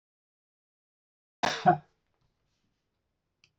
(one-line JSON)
{"cough_length": "3.6 s", "cough_amplitude": 11954, "cough_signal_mean_std_ratio": 0.19, "survey_phase": "alpha (2021-03-01 to 2021-08-12)", "age": "45-64", "gender": "Male", "wearing_mask": "No", "symptom_none": true, "smoker_status": "Never smoked", "respiratory_condition_asthma": false, "respiratory_condition_other": false, "recruitment_source": "REACT", "submission_delay": "2 days", "covid_test_result": "Negative", "covid_test_method": "RT-qPCR"}